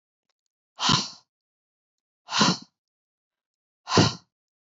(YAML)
exhalation_length: 4.8 s
exhalation_amplitude: 18335
exhalation_signal_mean_std_ratio: 0.29
survey_phase: alpha (2021-03-01 to 2021-08-12)
age: 18-44
gender: Female
wearing_mask: 'No'
symptom_none: true
symptom_onset: 12 days
smoker_status: Never smoked
respiratory_condition_asthma: false
respiratory_condition_other: false
recruitment_source: REACT
submission_delay: 2 days
covid_test_result: Negative
covid_test_method: RT-qPCR